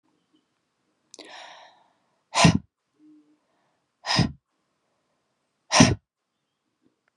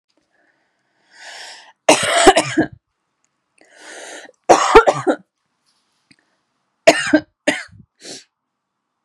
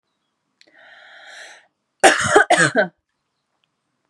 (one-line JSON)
{"exhalation_length": "7.2 s", "exhalation_amplitude": 27310, "exhalation_signal_mean_std_ratio": 0.23, "three_cough_length": "9.0 s", "three_cough_amplitude": 32768, "three_cough_signal_mean_std_ratio": 0.31, "cough_length": "4.1 s", "cough_amplitude": 32767, "cough_signal_mean_std_ratio": 0.32, "survey_phase": "beta (2021-08-13 to 2022-03-07)", "age": "18-44", "gender": "Female", "wearing_mask": "No", "symptom_none": true, "smoker_status": "Never smoked", "respiratory_condition_asthma": false, "respiratory_condition_other": false, "recruitment_source": "REACT", "submission_delay": "1 day", "covid_test_result": "Negative", "covid_test_method": "RT-qPCR", "influenza_a_test_result": "Negative", "influenza_b_test_result": "Negative"}